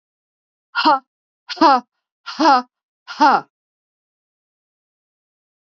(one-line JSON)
{"exhalation_length": "5.6 s", "exhalation_amplitude": 30615, "exhalation_signal_mean_std_ratio": 0.31, "survey_phase": "beta (2021-08-13 to 2022-03-07)", "age": "65+", "gender": "Female", "wearing_mask": "No", "symptom_none": true, "smoker_status": "Never smoked", "respiratory_condition_asthma": false, "respiratory_condition_other": false, "recruitment_source": "REACT", "submission_delay": "2 days", "covid_test_result": "Negative", "covid_test_method": "RT-qPCR", "influenza_a_test_result": "Negative", "influenza_b_test_result": "Negative"}